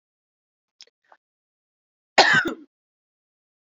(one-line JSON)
{"cough_length": "3.7 s", "cough_amplitude": 31049, "cough_signal_mean_std_ratio": 0.22, "survey_phase": "beta (2021-08-13 to 2022-03-07)", "age": "18-44", "gender": "Female", "wearing_mask": "No", "symptom_new_continuous_cough": true, "symptom_runny_or_blocked_nose": true, "symptom_sore_throat": true, "symptom_fatigue": true, "symptom_fever_high_temperature": true, "symptom_headache": true, "smoker_status": "Never smoked", "respiratory_condition_asthma": false, "respiratory_condition_other": false, "recruitment_source": "Test and Trace", "submission_delay": "2 days", "covid_test_result": "Positive", "covid_test_method": "RT-qPCR", "covid_ct_value": 15.3, "covid_ct_gene": "ORF1ab gene", "covid_ct_mean": 15.6, "covid_viral_load": "7800000 copies/ml", "covid_viral_load_category": "High viral load (>1M copies/ml)"}